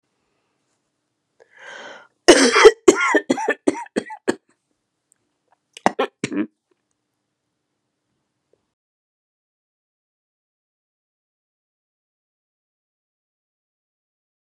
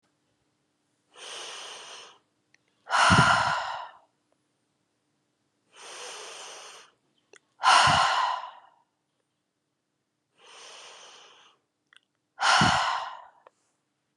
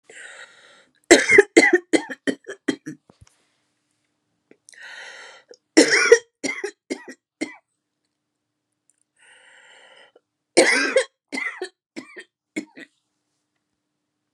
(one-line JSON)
{"cough_length": "14.4 s", "cough_amplitude": 32768, "cough_signal_mean_std_ratio": 0.21, "exhalation_length": "14.2 s", "exhalation_amplitude": 15952, "exhalation_signal_mean_std_ratio": 0.35, "three_cough_length": "14.3 s", "three_cough_amplitude": 32768, "three_cough_signal_mean_std_ratio": 0.27, "survey_phase": "beta (2021-08-13 to 2022-03-07)", "age": "45-64", "gender": "Female", "wearing_mask": "No", "symptom_runny_or_blocked_nose": true, "symptom_onset": "8 days", "smoker_status": "Never smoked", "respiratory_condition_asthma": false, "respiratory_condition_other": false, "recruitment_source": "REACT", "submission_delay": "1 day", "covid_test_result": "Negative", "covid_test_method": "RT-qPCR"}